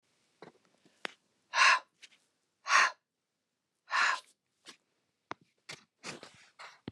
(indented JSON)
{
  "exhalation_length": "6.9 s",
  "exhalation_amplitude": 10449,
  "exhalation_signal_mean_std_ratio": 0.27,
  "survey_phase": "beta (2021-08-13 to 2022-03-07)",
  "age": "45-64",
  "gender": "Female",
  "wearing_mask": "No",
  "symptom_fatigue": true,
  "smoker_status": "Never smoked",
  "respiratory_condition_asthma": false,
  "respiratory_condition_other": false,
  "recruitment_source": "REACT",
  "submission_delay": "1 day",
  "covid_test_result": "Negative",
  "covid_test_method": "RT-qPCR"
}